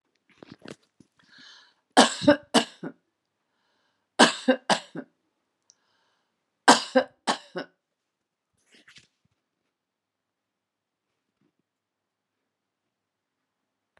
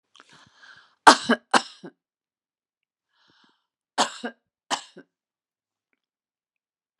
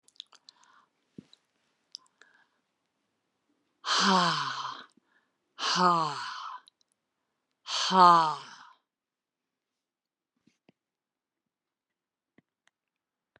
{"three_cough_length": "14.0 s", "three_cough_amplitude": 30411, "three_cough_signal_mean_std_ratio": 0.2, "cough_length": "7.0 s", "cough_amplitude": 32768, "cough_signal_mean_std_ratio": 0.17, "exhalation_length": "13.4 s", "exhalation_amplitude": 14310, "exhalation_signal_mean_std_ratio": 0.28, "survey_phase": "beta (2021-08-13 to 2022-03-07)", "age": "65+", "gender": "Female", "wearing_mask": "No", "symptom_other": true, "symptom_onset": "12 days", "smoker_status": "Never smoked", "respiratory_condition_asthma": false, "respiratory_condition_other": false, "recruitment_source": "REACT", "submission_delay": "1 day", "covid_test_result": "Negative", "covid_test_method": "RT-qPCR"}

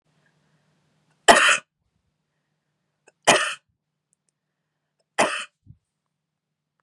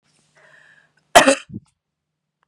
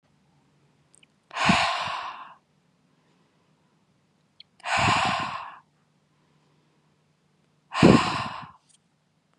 {"three_cough_length": "6.8 s", "three_cough_amplitude": 32768, "three_cough_signal_mean_std_ratio": 0.23, "cough_length": "2.5 s", "cough_amplitude": 32768, "cough_signal_mean_std_ratio": 0.22, "exhalation_length": "9.4 s", "exhalation_amplitude": 27187, "exhalation_signal_mean_std_ratio": 0.33, "survey_phase": "beta (2021-08-13 to 2022-03-07)", "age": "18-44", "gender": "Female", "wearing_mask": "No", "symptom_none": true, "symptom_onset": "4 days", "smoker_status": "Never smoked", "respiratory_condition_asthma": false, "respiratory_condition_other": false, "recruitment_source": "REACT", "submission_delay": "1 day", "covid_test_result": "Negative", "covid_test_method": "RT-qPCR", "influenza_a_test_result": "Negative", "influenza_b_test_result": "Negative"}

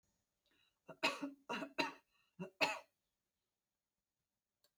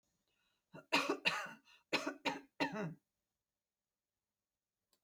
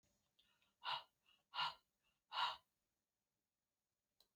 {"three_cough_length": "4.8 s", "three_cough_amplitude": 3640, "three_cough_signal_mean_std_ratio": 0.3, "cough_length": "5.0 s", "cough_amplitude": 4119, "cough_signal_mean_std_ratio": 0.35, "exhalation_length": "4.4 s", "exhalation_amplitude": 1146, "exhalation_signal_mean_std_ratio": 0.29, "survey_phase": "alpha (2021-03-01 to 2021-08-12)", "age": "65+", "gender": "Female", "wearing_mask": "No", "symptom_none": true, "smoker_status": "Ex-smoker", "respiratory_condition_asthma": false, "respiratory_condition_other": false, "recruitment_source": "REACT", "submission_delay": "1 day", "covid_test_result": "Negative", "covid_test_method": "RT-qPCR"}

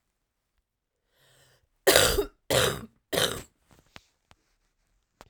{"three_cough_length": "5.3 s", "three_cough_amplitude": 30203, "three_cough_signal_mean_std_ratio": 0.31, "survey_phase": "beta (2021-08-13 to 2022-03-07)", "age": "45-64", "gender": "Female", "wearing_mask": "No", "symptom_cough_any": true, "symptom_runny_or_blocked_nose": true, "symptom_sore_throat": true, "symptom_onset": "4 days", "smoker_status": "Ex-smoker", "respiratory_condition_asthma": false, "respiratory_condition_other": false, "recruitment_source": "Test and Trace", "submission_delay": "1 day", "covid_test_result": "Positive", "covid_test_method": "RT-qPCR", "covid_ct_value": 21.4, "covid_ct_gene": "N gene"}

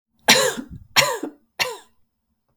{"three_cough_length": "2.6 s", "three_cough_amplitude": 32768, "three_cough_signal_mean_std_ratio": 0.38, "survey_phase": "beta (2021-08-13 to 2022-03-07)", "age": "45-64", "gender": "Female", "wearing_mask": "No", "symptom_runny_or_blocked_nose": true, "symptom_headache": true, "symptom_onset": "8 days", "smoker_status": "Ex-smoker", "respiratory_condition_asthma": false, "respiratory_condition_other": false, "recruitment_source": "REACT", "submission_delay": "1 day", "covid_test_result": "Negative", "covid_test_method": "RT-qPCR"}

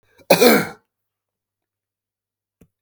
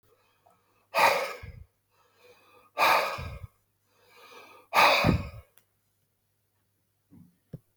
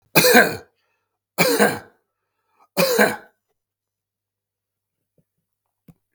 {"cough_length": "2.8 s", "cough_amplitude": 32768, "cough_signal_mean_std_ratio": 0.27, "exhalation_length": "7.8 s", "exhalation_amplitude": 12693, "exhalation_signal_mean_std_ratio": 0.34, "three_cough_length": "6.1 s", "three_cough_amplitude": 32768, "three_cough_signal_mean_std_ratio": 0.33, "survey_phase": "beta (2021-08-13 to 2022-03-07)", "age": "65+", "gender": "Male", "wearing_mask": "No", "symptom_none": true, "smoker_status": "Never smoked", "respiratory_condition_asthma": false, "respiratory_condition_other": false, "recruitment_source": "REACT", "submission_delay": "2 days", "covid_test_result": "Negative", "covid_test_method": "RT-qPCR", "influenza_a_test_result": "Negative", "influenza_b_test_result": "Negative"}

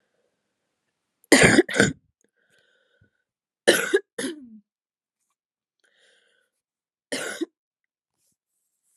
{"three_cough_length": "9.0 s", "three_cough_amplitude": 29763, "three_cough_signal_mean_std_ratio": 0.24, "survey_phase": "alpha (2021-03-01 to 2021-08-12)", "age": "18-44", "gender": "Female", "wearing_mask": "No", "symptom_cough_any": true, "symptom_new_continuous_cough": true, "symptom_shortness_of_breath": true, "symptom_abdominal_pain": true, "symptom_diarrhoea": true, "symptom_fatigue": true, "symptom_headache": true, "symptom_onset": "5 days", "smoker_status": "Never smoked", "respiratory_condition_asthma": false, "respiratory_condition_other": false, "recruitment_source": "Test and Trace", "submission_delay": "3 days", "covid_test_result": "Positive", "covid_test_method": "ePCR"}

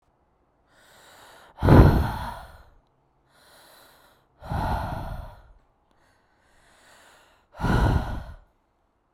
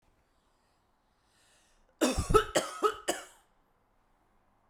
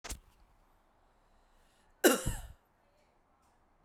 {"exhalation_length": "9.1 s", "exhalation_amplitude": 28033, "exhalation_signal_mean_std_ratio": 0.32, "three_cough_length": "4.7 s", "three_cough_amplitude": 12363, "three_cough_signal_mean_std_ratio": 0.3, "cough_length": "3.8 s", "cough_amplitude": 10708, "cough_signal_mean_std_ratio": 0.23, "survey_phase": "beta (2021-08-13 to 2022-03-07)", "age": "18-44", "gender": "Female", "wearing_mask": "No", "symptom_none": true, "smoker_status": "Ex-smoker", "respiratory_condition_asthma": true, "respiratory_condition_other": false, "recruitment_source": "REACT", "submission_delay": "0 days", "covid_test_result": "Negative", "covid_test_method": "RT-qPCR"}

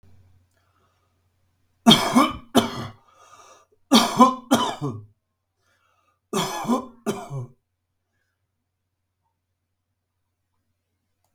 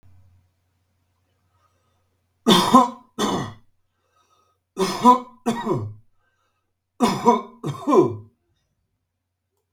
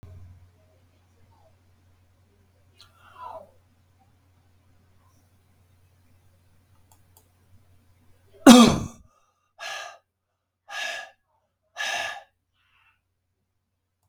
{"cough_length": "11.3 s", "cough_amplitude": 32768, "cough_signal_mean_std_ratio": 0.29, "three_cough_length": "9.7 s", "three_cough_amplitude": 32768, "three_cough_signal_mean_std_ratio": 0.34, "exhalation_length": "14.1 s", "exhalation_amplitude": 32768, "exhalation_signal_mean_std_ratio": 0.17, "survey_phase": "beta (2021-08-13 to 2022-03-07)", "age": "65+", "gender": "Male", "wearing_mask": "No", "symptom_none": true, "smoker_status": "Current smoker (e-cigarettes or vapes only)", "respiratory_condition_asthma": false, "respiratory_condition_other": false, "recruitment_source": "REACT", "submission_delay": "4 days", "covid_test_result": "Negative", "covid_test_method": "RT-qPCR", "influenza_a_test_result": "Negative", "influenza_b_test_result": "Negative"}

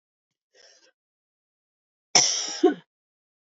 {"cough_length": "3.5 s", "cough_amplitude": 26757, "cough_signal_mean_std_ratio": 0.26, "survey_phase": "beta (2021-08-13 to 2022-03-07)", "age": "45-64", "gender": "Female", "wearing_mask": "No", "symptom_cough_any": true, "symptom_new_continuous_cough": true, "symptom_runny_or_blocked_nose": true, "symptom_fatigue": true, "symptom_change_to_sense_of_smell_or_taste": true, "symptom_onset": "2 days", "smoker_status": "Current smoker (e-cigarettes or vapes only)", "respiratory_condition_asthma": false, "respiratory_condition_other": false, "recruitment_source": "Test and Trace", "submission_delay": "1 day", "covid_test_result": "Positive", "covid_test_method": "RT-qPCR", "covid_ct_value": 33.0, "covid_ct_gene": "N gene"}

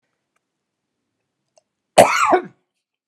{"cough_length": "3.1 s", "cough_amplitude": 32768, "cough_signal_mean_std_ratio": 0.27, "survey_phase": "beta (2021-08-13 to 2022-03-07)", "age": "65+", "gender": "Female", "wearing_mask": "No", "symptom_cough_any": true, "smoker_status": "Never smoked", "respiratory_condition_asthma": false, "respiratory_condition_other": false, "recruitment_source": "REACT", "submission_delay": "3 days", "covid_test_result": "Negative", "covid_test_method": "RT-qPCR", "influenza_a_test_result": "Negative", "influenza_b_test_result": "Negative"}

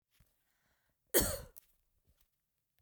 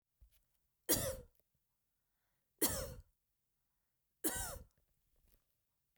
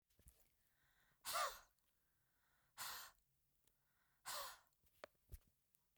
{"cough_length": "2.8 s", "cough_amplitude": 6274, "cough_signal_mean_std_ratio": 0.22, "three_cough_length": "6.0 s", "three_cough_amplitude": 3779, "three_cough_signal_mean_std_ratio": 0.29, "exhalation_length": "6.0 s", "exhalation_amplitude": 908, "exhalation_signal_mean_std_ratio": 0.33, "survey_phase": "beta (2021-08-13 to 2022-03-07)", "age": "45-64", "gender": "Female", "wearing_mask": "No", "symptom_none": true, "smoker_status": "Never smoked", "respiratory_condition_asthma": false, "respiratory_condition_other": false, "recruitment_source": "REACT", "submission_delay": "2 days", "covid_test_result": "Negative", "covid_test_method": "RT-qPCR", "influenza_a_test_result": "Unknown/Void", "influenza_b_test_result": "Unknown/Void"}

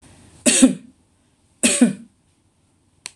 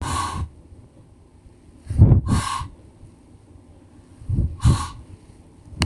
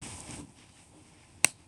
{"three_cough_length": "3.2 s", "three_cough_amplitude": 26027, "three_cough_signal_mean_std_ratio": 0.33, "exhalation_length": "5.9 s", "exhalation_amplitude": 26028, "exhalation_signal_mean_std_ratio": 0.41, "cough_length": "1.7 s", "cough_amplitude": 26028, "cough_signal_mean_std_ratio": 0.2, "survey_phase": "beta (2021-08-13 to 2022-03-07)", "age": "65+", "gender": "Female", "wearing_mask": "No", "symptom_none": true, "smoker_status": "Never smoked", "respiratory_condition_asthma": false, "respiratory_condition_other": false, "recruitment_source": "REACT", "submission_delay": "0 days", "covid_test_result": "Negative", "covid_test_method": "RT-qPCR"}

